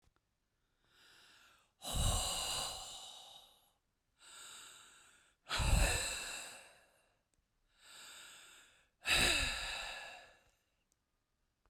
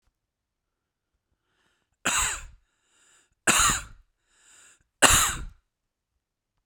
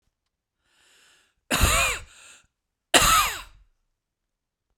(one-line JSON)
{"exhalation_length": "11.7 s", "exhalation_amplitude": 3808, "exhalation_signal_mean_std_ratio": 0.42, "three_cough_length": "6.7 s", "three_cough_amplitude": 30660, "three_cough_signal_mean_std_ratio": 0.3, "cough_length": "4.8 s", "cough_amplitude": 32767, "cough_signal_mean_std_ratio": 0.34, "survey_phase": "beta (2021-08-13 to 2022-03-07)", "age": "45-64", "gender": "Male", "wearing_mask": "No", "symptom_cough_any": true, "symptom_fatigue": true, "symptom_onset": "3 days", "smoker_status": "Ex-smoker", "respiratory_condition_asthma": false, "respiratory_condition_other": false, "recruitment_source": "Test and Trace", "submission_delay": "1 day", "covid_test_result": "Positive", "covid_test_method": "RT-qPCR", "covid_ct_value": 21.9, "covid_ct_gene": "N gene"}